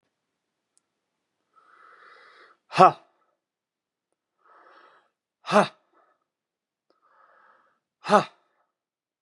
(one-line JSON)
{"exhalation_length": "9.2 s", "exhalation_amplitude": 31623, "exhalation_signal_mean_std_ratio": 0.16, "survey_phase": "beta (2021-08-13 to 2022-03-07)", "age": "45-64", "gender": "Male", "wearing_mask": "No", "symptom_runny_or_blocked_nose": true, "smoker_status": "Never smoked", "respiratory_condition_asthma": false, "respiratory_condition_other": false, "recruitment_source": "Test and Trace", "submission_delay": "2 days", "covid_test_result": "Positive", "covid_test_method": "ePCR"}